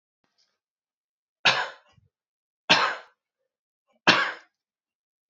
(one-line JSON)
{"three_cough_length": "5.3 s", "three_cough_amplitude": 25225, "three_cough_signal_mean_std_ratio": 0.26, "survey_phase": "beta (2021-08-13 to 2022-03-07)", "age": "18-44", "gender": "Male", "wearing_mask": "No", "symptom_runny_or_blocked_nose": true, "symptom_onset": "2 days", "smoker_status": "Never smoked", "respiratory_condition_asthma": false, "respiratory_condition_other": false, "recruitment_source": "REACT", "submission_delay": "4 days", "covid_test_result": "Positive", "covid_test_method": "RT-qPCR", "covid_ct_value": 28.5, "covid_ct_gene": "E gene", "influenza_a_test_result": "Negative", "influenza_b_test_result": "Negative"}